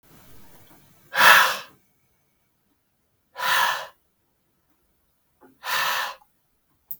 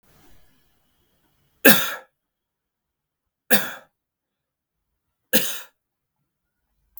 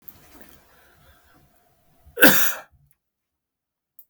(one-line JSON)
{"exhalation_length": "7.0 s", "exhalation_amplitude": 32768, "exhalation_signal_mean_std_ratio": 0.31, "three_cough_length": "7.0 s", "three_cough_amplitude": 32768, "three_cough_signal_mean_std_ratio": 0.21, "cough_length": "4.1 s", "cough_amplitude": 32768, "cough_signal_mean_std_ratio": 0.23, "survey_phase": "beta (2021-08-13 to 2022-03-07)", "age": "18-44", "gender": "Male", "wearing_mask": "No", "symptom_none": true, "smoker_status": "Never smoked", "respiratory_condition_asthma": false, "respiratory_condition_other": false, "recruitment_source": "REACT", "submission_delay": "4 days", "covid_test_result": "Negative", "covid_test_method": "RT-qPCR", "influenza_a_test_result": "Negative", "influenza_b_test_result": "Negative"}